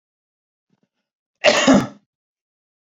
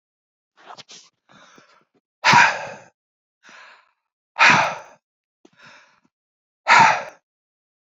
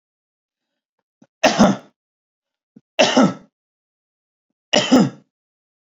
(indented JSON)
{
  "cough_length": "3.0 s",
  "cough_amplitude": 29494,
  "cough_signal_mean_std_ratio": 0.29,
  "exhalation_length": "7.9 s",
  "exhalation_amplitude": 32767,
  "exhalation_signal_mean_std_ratio": 0.29,
  "three_cough_length": "6.0 s",
  "three_cough_amplitude": 29205,
  "three_cough_signal_mean_std_ratio": 0.31,
  "survey_phase": "beta (2021-08-13 to 2022-03-07)",
  "age": "45-64",
  "gender": "Male",
  "wearing_mask": "No",
  "symptom_none": true,
  "smoker_status": "Ex-smoker",
  "respiratory_condition_asthma": false,
  "respiratory_condition_other": false,
  "recruitment_source": "REACT",
  "submission_delay": "10 days",
  "covid_test_result": "Negative",
  "covid_test_method": "RT-qPCR",
  "influenza_a_test_result": "Negative",
  "influenza_b_test_result": "Negative"
}